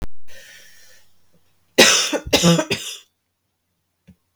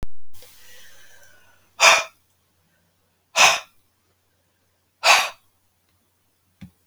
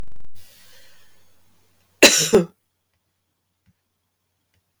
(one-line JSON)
{"three_cough_length": "4.4 s", "three_cough_amplitude": 32768, "three_cough_signal_mean_std_ratio": 0.42, "exhalation_length": "6.9 s", "exhalation_amplitude": 32768, "exhalation_signal_mean_std_ratio": 0.32, "cough_length": "4.8 s", "cough_amplitude": 32768, "cough_signal_mean_std_ratio": 0.31, "survey_phase": "beta (2021-08-13 to 2022-03-07)", "age": "45-64", "gender": "Female", "wearing_mask": "No", "symptom_cough_any": true, "symptom_fatigue": true, "smoker_status": "Ex-smoker", "respiratory_condition_asthma": false, "respiratory_condition_other": false, "recruitment_source": "REACT", "submission_delay": "0 days", "covid_test_result": "Positive", "covid_test_method": "RT-qPCR", "covid_ct_value": 19.0, "covid_ct_gene": "E gene", "influenza_a_test_result": "Negative", "influenza_b_test_result": "Negative"}